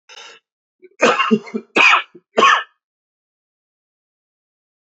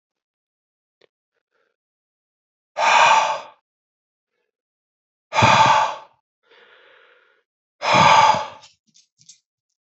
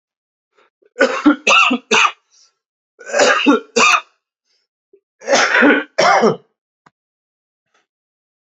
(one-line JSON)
{"cough_length": "4.9 s", "cough_amplitude": 32767, "cough_signal_mean_std_ratio": 0.35, "exhalation_length": "9.8 s", "exhalation_amplitude": 25898, "exhalation_signal_mean_std_ratio": 0.35, "three_cough_length": "8.4 s", "three_cough_amplitude": 32768, "three_cough_signal_mean_std_ratio": 0.45, "survey_phase": "beta (2021-08-13 to 2022-03-07)", "age": "45-64", "gender": "Male", "wearing_mask": "No", "symptom_cough_any": true, "symptom_new_continuous_cough": true, "symptom_runny_or_blocked_nose": true, "symptom_shortness_of_breath": true, "symptom_sore_throat": true, "symptom_fatigue": true, "symptom_fever_high_temperature": true, "symptom_headache": true, "symptom_onset": "4 days", "smoker_status": "Ex-smoker", "respiratory_condition_asthma": false, "respiratory_condition_other": false, "recruitment_source": "Test and Trace", "submission_delay": "2 days", "covid_test_result": "Positive", "covid_test_method": "RT-qPCR", "covid_ct_value": 18.4, "covid_ct_gene": "N gene", "covid_ct_mean": 18.7, "covid_viral_load": "760000 copies/ml", "covid_viral_load_category": "Low viral load (10K-1M copies/ml)"}